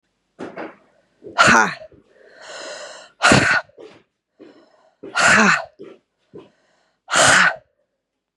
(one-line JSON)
{"exhalation_length": "8.4 s", "exhalation_amplitude": 32767, "exhalation_signal_mean_std_ratio": 0.39, "survey_phase": "beta (2021-08-13 to 2022-03-07)", "age": "18-44", "gender": "Female", "wearing_mask": "No", "symptom_cough_any": true, "symptom_runny_or_blocked_nose": true, "symptom_sore_throat": true, "symptom_fatigue": true, "symptom_headache": true, "symptom_other": true, "smoker_status": "Ex-smoker", "respiratory_condition_asthma": false, "respiratory_condition_other": false, "recruitment_source": "Test and Trace", "submission_delay": "4 days", "covid_test_result": "Positive", "covid_test_method": "LAMP"}